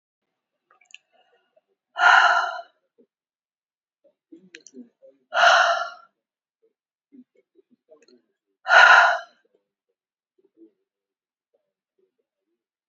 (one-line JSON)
{"exhalation_length": "12.9 s", "exhalation_amplitude": 27733, "exhalation_signal_mean_std_ratio": 0.27, "survey_phase": "beta (2021-08-13 to 2022-03-07)", "age": "65+", "gender": "Female", "wearing_mask": "No", "symptom_cough_any": true, "symptom_runny_or_blocked_nose": true, "symptom_fatigue": true, "symptom_headache": true, "symptom_onset": "2 days", "smoker_status": "Ex-smoker", "respiratory_condition_asthma": false, "respiratory_condition_other": false, "recruitment_source": "Test and Trace", "submission_delay": "1 day", "covid_test_result": "Positive", "covid_test_method": "ePCR"}